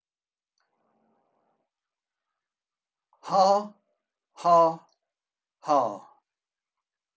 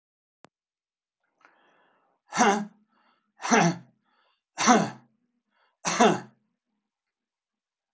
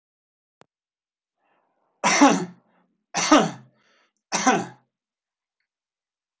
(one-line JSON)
{"exhalation_length": "7.2 s", "exhalation_amplitude": 12605, "exhalation_signal_mean_std_ratio": 0.28, "cough_length": "7.9 s", "cough_amplitude": 19488, "cough_signal_mean_std_ratio": 0.29, "three_cough_length": "6.4 s", "three_cough_amplitude": 23645, "three_cough_signal_mean_std_ratio": 0.3, "survey_phase": "alpha (2021-03-01 to 2021-08-12)", "age": "65+", "gender": "Male", "wearing_mask": "No", "symptom_none": true, "smoker_status": "Never smoked", "respiratory_condition_asthma": false, "respiratory_condition_other": false, "recruitment_source": "REACT", "submission_delay": "2 days", "covid_test_result": "Negative", "covid_test_method": "RT-qPCR"}